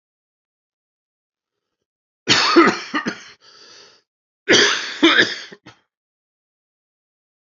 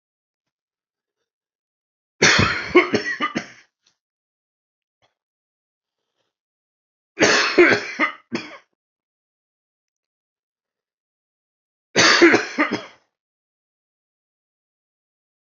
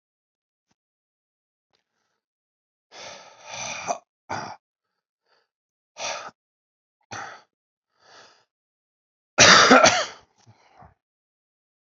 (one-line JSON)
{"cough_length": "7.4 s", "cough_amplitude": 29673, "cough_signal_mean_std_ratio": 0.33, "three_cough_length": "15.5 s", "three_cough_amplitude": 30912, "three_cough_signal_mean_std_ratio": 0.29, "exhalation_length": "11.9 s", "exhalation_amplitude": 32471, "exhalation_signal_mean_std_ratio": 0.22, "survey_phase": "alpha (2021-03-01 to 2021-08-12)", "age": "45-64", "gender": "Male", "wearing_mask": "No", "symptom_cough_any": true, "symptom_shortness_of_breath": true, "symptom_headache": true, "symptom_onset": "4 days", "smoker_status": "Never smoked", "respiratory_condition_asthma": true, "respiratory_condition_other": false, "recruitment_source": "Test and Trace", "submission_delay": "2 days", "covid_test_result": "Positive", "covid_test_method": "RT-qPCR", "covid_ct_value": 22.0, "covid_ct_gene": "N gene"}